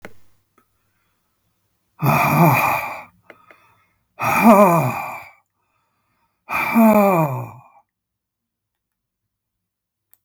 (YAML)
exhalation_length: 10.2 s
exhalation_amplitude: 32766
exhalation_signal_mean_std_ratio: 0.41
survey_phase: beta (2021-08-13 to 2022-03-07)
age: 65+
gender: Male
wearing_mask: 'No'
symptom_cough_any: true
symptom_runny_or_blocked_nose: true
smoker_status: Ex-smoker
respiratory_condition_asthma: false
respiratory_condition_other: false
recruitment_source: REACT
submission_delay: 1 day
covid_test_result: Negative
covid_test_method: RT-qPCR
influenza_a_test_result: Negative
influenza_b_test_result: Negative